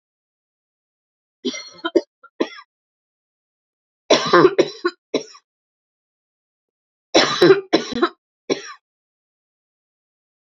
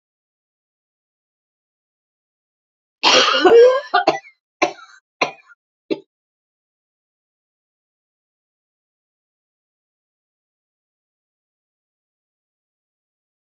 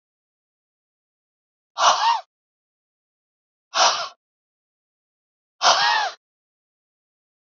{"three_cough_length": "10.6 s", "three_cough_amplitude": 32767, "three_cough_signal_mean_std_ratio": 0.28, "cough_length": "13.6 s", "cough_amplitude": 31409, "cough_signal_mean_std_ratio": 0.22, "exhalation_length": "7.5 s", "exhalation_amplitude": 27539, "exhalation_signal_mean_std_ratio": 0.31, "survey_phase": "beta (2021-08-13 to 2022-03-07)", "age": "45-64", "gender": "Female", "wearing_mask": "No", "symptom_none": true, "symptom_onset": "8 days", "smoker_status": "Never smoked", "respiratory_condition_asthma": false, "respiratory_condition_other": false, "recruitment_source": "REACT", "submission_delay": "-1 day", "covid_test_result": "Negative", "covid_test_method": "RT-qPCR", "influenza_a_test_result": "Negative", "influenza_b_test_result": "Negative"}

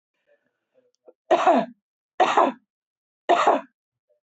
{"three_cough_length": "4.4 s", "three_cough_amplitude": 18309, "three_cough_signal_mean_std_ratio": 0.36, "survey_phase": "beta (2021-08-13 to 2022-03-07)", "age": "45-64", "gender": "Female", "wearing_mask": "No", "symptom_none": true, "smoker_status": "Current smoker (e-cigarettes or vapes only)", "respiratory_condition_asthma": false, "respiratory_condition_other": false, "recruitment_source": "REACT", "submission_delay": "2 days", "covid_test_result": "Negative", "covid_test_method": "RT-qPCR"}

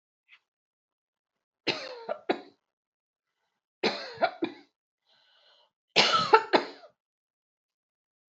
{"three_cough_length": "8.4 s", "three_cough_amplitude": 20120, "three_cough_signal_mean_std_ratio": 0.26, "survey_phase": "beta (2021-08-13 to 2022-03-07)", "age": "45-64", "gender": "Female", "wearing_mask": "No", "symptom_cough_any": true, "symptom_runny_or_blocked_nose": true, "symptom_onset": "4 days", "smoker_status": "Never smoked", "respiratory_condition_asthma": false, "respiratory_condition_other": false, "recruitment_source": "Test and Trace", "submission_delay": "2 days", "covid_test_result": "Positive", "covid_test_method": "RT-qPCR", "covid_ct_value": 17.1, "covid_ct_gene": "ORF1ab gene"}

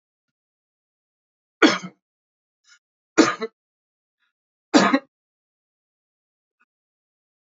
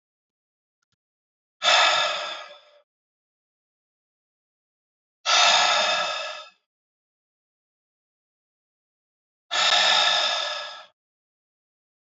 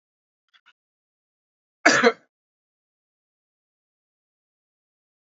{"three_cough_length": "7.4 s", "three_cough_amplitude": 27433, "three_cough_signal_mean_std_ratio": 0.21, "exhalation_length": "12.1 s", "exhalation_amplitude": 16820, "exhalation_signal_mean_std_ratio": 0.39, "cough_length": "5.2 s", "cough_amplitude": 28667, "cough_signal_mean_std_ratio": 0.17, "survey_phase": "beta (2021-08-13 to 2022-03-07)", "age": "45-64", "gender": "Male", "wearing_mask": "No", "symptom_none": true, "smoker_status": "Ex-smoker", "respiratory_condition_asthma": false, "respiratory_condition_other": false, "recruitment_source": "REACT", "submission_delay": "1 day", "covid_test_result": "Negative", "covid_test_method": "RT-qPCR"}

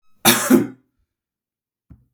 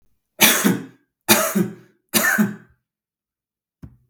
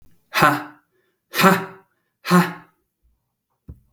{"cough_length": "2.1 s", "cough_amplitude": 32768, "cough_signal_mean_std_ratio": 0.32, "three_cough_length": "4.1 s", "three_cough_amplitude": 32768, "three_cough_signal_mean_std_ratio": 0.42, "exhalation_length": "3.9 s", "exhalation_amplitude": 32766, "exhalation_signal_mean_std_ratio": 0.35, "survey_phase": "beta (2021-08-13 to 2022-03-07)", "age": "45-64", "gender": "Male", "wearing_mask": "No", "symptom_none": true, "smoker_status": "Never smoked", "respiratory_condition_asthma": false, "respiratory_condition_other": false, "recruitment_source": "REACT", "submission_delay": "1 day", "covid_test_result": "Negative", "covid_test_method": "RT-qPCR"}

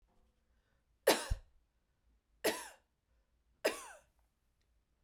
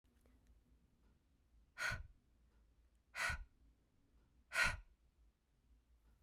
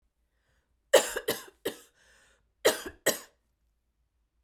{"three_cough_length": "5.0 s", "three_cough_amplitude": 6730, "three_cough_signal_mean_std_ratio": 0.24, "exhalation_length": "6.2 s", "exhalation_amplitude": 2338, "exhalation_signal_mean_std_ratio": 0.3, "cough_length": "4.4 s", "cough_amplitude": 15731, "cough_signal_mean_std_ratio": 0.25, "survey_phase": "beta (2021-08-13 to 2022-03-07)", "age": "18-44", "gender": "Female", "wearing_mask": "No", "symptom_sore_throat": true, "smoker_status": "Never smoked", "respiratory_condition_asthma": false, "respiratory_condition_other": false, "recruitment_source": "Test and Trace", "submission_delay": "1 day", "covid_test_result": "Positive", "covid_test_method": "RT-qPCR", "covid_ct_value": 17.2, "covid_ct_gene": "ORF1ab gene", "covid_ct_mean": 17.5, "covid_viral_load": "1800000 copies/ml", "covid_viral_load_category": "High viral load (>1M copies/ml)"}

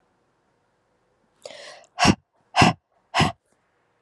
{"exhalation_length": "4.0 s", "exhalation_amplitude": 31662, "exhalation_signal_mean_std_ratio": 0.27, "survey_phase": "alpha (2021-03-01 to 2021-08-12)", "age": "18-44", "gender": "Female", "wearing_mask": "No", "symptom_cough_any": true, "symptom_headache": true, "symptom_onset": "3 days", "smoker_status": "Never smoked", "respiratory_condition_asthma": false, "respiratory_condition_other": false, "recruitment_source": "Test and Trace", "submission_delay": "1 day", "covid_test_result": "Positive"}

